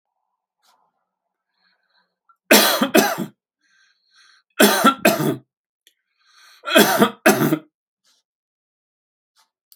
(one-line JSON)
{"three_cough_length": "9.8 s", "three_cough_amplitude": 32768, "three_cough_signal_mean_std_ratio": 0.34, "survey_phase": "alpha (2021-03-01 to 2021-08-12)", "age": "65+", "gender": "Male", "wearing_mask": "No", "symptom_none": true, "smoker_status": "Ex-smoker", "respiratory_condition_asthma": false, "respiratory_condition_other": false, "recruitment_source": "REACT", "submission_delay": "1 day", "covid_test_result": "Negative", "covid_test_method": "RT-qPCR"}